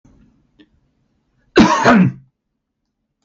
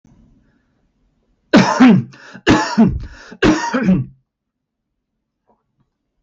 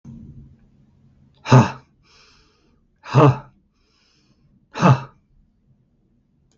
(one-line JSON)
{"cough_length": "3.2 s", "cough_amplitude": 32768, "cough_signal_mean_std_ratio": 0.34, "three_cough_length": "6.2 s", "three_cough_amplitude": 32768, "three_cough_signal_mean_std_ratio": 0.4, "exhalation_length": "6.6 s", "exhalation_amplitude": 32766, "exhalation_signal_mean_std_ratio": 0.26, "survey_phase": "beta (2021-08-13 to 2022-03-07)", "age": "45-64", "gender": "Male", "wearing_mask": "No", "symptom_none": true, "smoker_status": "Never smoked", "respiratory_condition_asthma": false, "respiratory_condition_other": false, "recruitment_source": "REACT", "submission_delay": "1 day", "covid_test_result": "Negative", "covid_test_method": "RT-qPCR"}